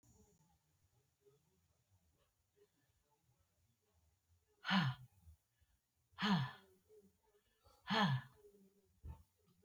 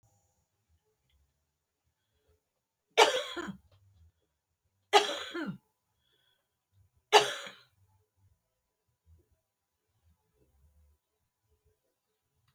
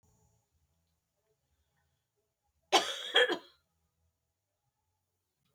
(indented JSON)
{
  "exhalation_length": "9.6 s",
  "exhalation_amplitude": 2611,
  "exhalation_signal_mean_std_ratio": 0.28,
  "three_cough_length": "12.5 s",
  "three_cough_amplitude": 17260,
  "three_cough_signal_mean_std_ratio": 0.19,
  "cough_length": "5.5 s",
  "cough_amplitude": 8656,
  "cough_signal_mean_std_ratio": 0.21,
  "survey_phase": "beta (2021-08-13 to 2022-03-07)",
  "age": "65+",
  "gender": "Female",
  "wearing_mask": "No",
  "symptom_none": true,
  "smoker_status": "Never smoked",
  "respiratory_condition_asthma": false,
  "respiratory_condition_other": false,
  "recruitment_source": "REACT",
  "submission_delay": "4 days",
  "covid_test_result": "Negative",
  "covid_test_method": "RT-qPCR"
}